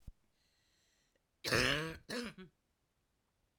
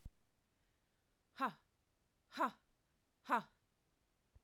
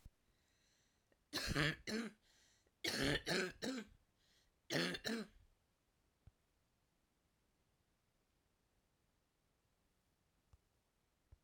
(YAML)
cough_length: 3.6 s
cough_amplitude: 3766
cough_signal_mean_std_ratio: 0.33
exhalation_length: 4.4 s
exhalation_amplitude: 2373
exhalation_signal_mean_std_ratio: 0.23
three_cough_length: 11.4 s
three_cough_amplitude: 2178
three_cough_signal_mean_std_ratio: 0.33
survey_phase: alpha (2021-03-01 to 2021-08-12)
age: 45-64
gender: Female
wearing_mask: 'No'
symptom_cough_any: true
smoker_status: Never smoked
respiratory_condition_asthma: false
respiratory_condition_other: false
recruitment_source: REACT
submission_delay: 3 days
covid_test_result: Negative
covid_test_method: RT-qPCR